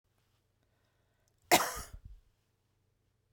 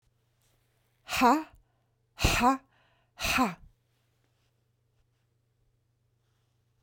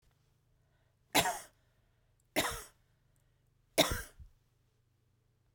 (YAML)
cough_length: 3.3 s
cough_amplitude: 11669
cough_signal_mean_std_ratio: 0.2
exhalation_length: 6.8 s
exhalation_amplitude: 11431
exhalation_signal_mean_std_ratio: 0.29
three_cough_length: 5.5 s
three_cough_amplitude: 10158
three_cough_signal_mean_std_ratio: 0.26
survey_phase: beta (2021-08-13 to 2022-03-07)
age: 65+
gender: Female
wearing_mask: 'No'
symptom_none: true
smoker_status: Never smoked
respiratory_condition_asthma: false
respiratory_condition_other: false
recruitment_source: REACT
submission_delay: 1 day
covid_test_result: Negative
covid_test_method: RT-qPCR